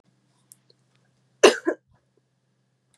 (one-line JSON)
{"cough_length": "3.0 s", "cough_amplitude": 30440, "cough_signal_mean_std_ratio": 0.17, "survey_phase": "beta (2021-08-13 to 2022-03-07)", "age": "18-44", "gender": "Female", "wearing_mask": "No", "symptom_cough_any": true, "symptom_onset": "9 days", "smoker_status": "Never smoked", "respiratory_condition_asthma": false, "respiratory_condition_other": false, "recruitment_source": "REACT", "submission_delay": "2 days", "covid_test_result": "Negative", "covid_test_method": "RT-qPCR", "influenza_a_test_result": "Negative", "influenza_b_test_result": "Negative"}